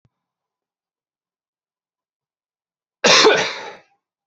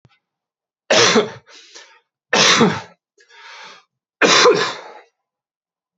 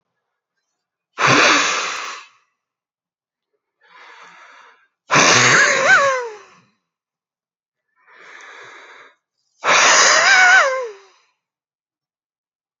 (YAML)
cough_length: 4.3 s
cough_amplitude: 31346
cough_signal_mean_std_ratio: 0.27
three_cough_length: 6.0 s
three_cough_amplitude: 31344
three_cough_signal_mean_std_ratio: 0.4
exhalation_length: 12.8 s
exhalation_amplitude: 32177
exhalation_signal_mean_std_ratio: 0.42
survey_phase: beta (2021-08-13 to 2022-03-07)
age: 45-64
gender: Male
wearing_mask: 'Yes'
symptom_cough_any: true
symptom_runny_or_blocked_nose: true
symptom_fatigue: true
symptom_change_to_sense_of_smell_or_taste: true
symptom_loss_of_taste: true
symptom_onset: 3 days
smoker_status: Never smoked
respiratory_condition_asthma: false
respiratory_condition_other: false
recruitment_source: Test and Trace
submission_delay: 2 days
covid_test_result: Positive
covid_test_method: RT-qPCR
covid_ct_value: 17.3
covid_ct_gene: ORF1ab gene
covid_ct_mean: 17.7
covid_viral_load: 1600000 copies/ml
covid_viral_load_category: High viral load (>1M copies/ml)